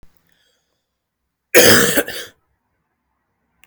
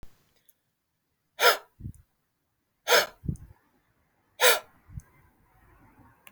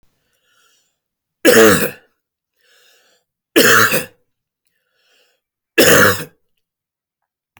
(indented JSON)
{
  "cough_length": "3.7 s",
  "cough_amplitude": 32768,
  "cough_signal_mean_std_ratio": 0.3,
  "exhalation_length": "6.3 s",
  "exhalation_amplitude": 18489,
  "exhalation_signal_mean_std_ratio": 0.25,
  "three_cough_length": "7.6 s",
  "three_cough_amplitude": 32768,
  "three_cough_signal_mean_std_ratio": 0.34,
  "survey_phase": "beta (2021-08-13 to 2022-03-07)",
  "age": "45-64",
  "gender": "Male",
  "wearing_mask": "No",
  "symptom_none": true,
  "smoker_status": "Ex-smoker",
  "respiratory_condition_asthma": false,
  "respiratory_condition_other": false,
  "recruitment_source": "REACT",
  "submission_delay": "2 days",
  "covid_test_result": "Negative",
  "covid_test_method": "RT-qPCR",
  "influenza_a_test_result": "Negative",
  "influenza_b_test_result": "Negative"
}